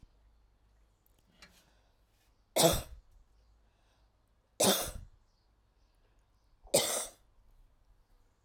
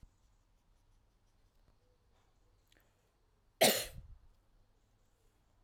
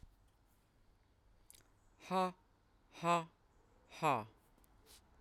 three_cough_length: 8.4 s
three_cough_amplitude: 12125
three_cough_signal_mean_std_ratio: 0.26
cough_length: 5.6 s
cough_amplitude: 6963
cough_signal_mean_std_ratio: 0.18
exhalation_length: 5.2 s
exhalation_amplitude: 2475
exhalation_signal_mean_std_ratio: 0.32
survey_phase: alpha (2021-03-01 to 2021-08-12)
age: 45-64
gender: Female
wearing_mask: 'No'
symptom_none: true
smoker_status: Current smoker (1 to 10 cigarettes per day)
respiratory_condition_asthma: false
respiratory_condition_other: false
recruitment_source: REACT
submission_delay: 2 days
covid_test_result: Negative
covid_test_method: RT-qPCR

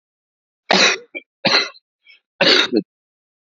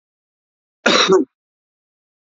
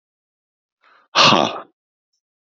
three_cough_length: 3.6 s
three_cough_amplitude: 32767
three_cough_signal_mean_std_ratio: 0.39
cough_length: 2.3 s
cough_amplitude: 27508
cough_signal_mean_std_ratio: 0.33
exhalation_length: 2.6 s
exhalation_amplitude: 31288
exhalation_signal_mean_std_ratio: 0.29
survey_phase: beta (2021-08-13 to 2022-03-07)
age: 65+
gender: Male
wearing_mask: 'No'
symptom_cough_any: true
symptom_runny_or_blocked_nose: true
smoker_status: Never smoked
respiratory_condition_asthma: false
respiratory_condition_other: false
recruitment_source: REACT
submission_delay: 4 days
covid_test_result: Negative
covid_test_method: RT-qPCR
influenza_a_test_result: Negative
influenza_b_test_result: Negative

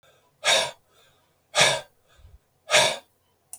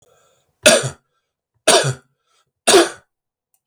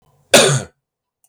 exhalation_length: 3.6 s
exhalation_amplitude: 19311
exhalation_signal_mean_std_ratio: 0.36
three_cough_length: 3.7 s
three_cough_amplitude: 32768
three_cough_signal_mean_std_ratio: 0.34
cough_length: 1.3 s
cough_amplitude: 32768
cough_signal_mean_std_ratio: 0.38
survey_phase: beta (2021-08-13 to 2022-03-07)
age: 45-64
gender: Male
wearing_mask: 'No'
symptom_none: true
smoker_status: Never smoked
respiratory_condition_asthma: false
respiratory_condition_other: false
recruitment_source: REACT
submission_delay: 2 days
covid_test_result: Negative
covid_test_method: RT-qPCR
influenza_a_test_result: Negative
influenza_b_test_result: Negative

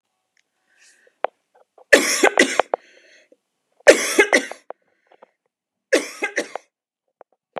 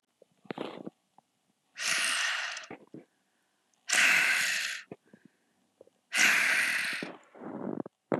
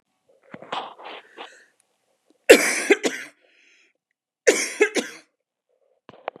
three_cough_length: 7.6 s
three_cough_amplitude: 32768
three_cough_signal_mean_std_ratio: 0.28
exhalation_length: 8.2 s
exhalation_amplitude: 9956
exhalation_signal_mean_std_ratio: 0.5
cough_length: 6.4 s
cough_amplitude: 32768
cough_signal_mean_std_ratio: 0.27
survey_phase: beta (2021-08-13 to 2022-03-07)
age: 45-64
gender: Female
wearing_mask: 'No'
symptom_cough_any: true
symptom_sore_throat: true
symptom_onset: 13 days
smoker_status: Ex-smoker
respiratory_condition_asthma: false
respiratory_condition_other: false
recruitment_source: REACT
submission_delay: 8 days
covid_test_result: Negative
covid_test_method: RT-qPCR
influenza_a_test_result: Negative
influenza_b_test_result: Negative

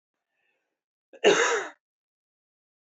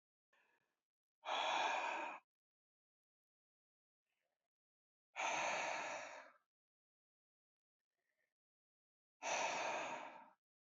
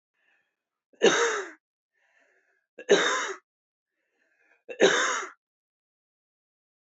cough_length: 3.0 s
cough_amplitude: 14502
cough_signal_mean_std_ratio: 0.28
exhalation_length: 10.8 s
exhalation_amplitude: 1313
exhalation_signal_mean_std_ratio: 0.42
three_cough_length: 6.9 s
three_cough_amplitude: 15067
three_cough_signal_mean_std_ratio: 0.32
survey_phase: alpha (2021-03-01 to 2021-08-12)
age: 18-44
gender: Male
wearing_mask: 'No'
symptom_none: true
smoker_status: Ex-smoker
respiratory_condition_asthma: false
respiratory_condition_other: false
recruitment_source: REACT
submission_delay: 1 day
covid_test_result: Negative
covid_test_method: RT-qPCR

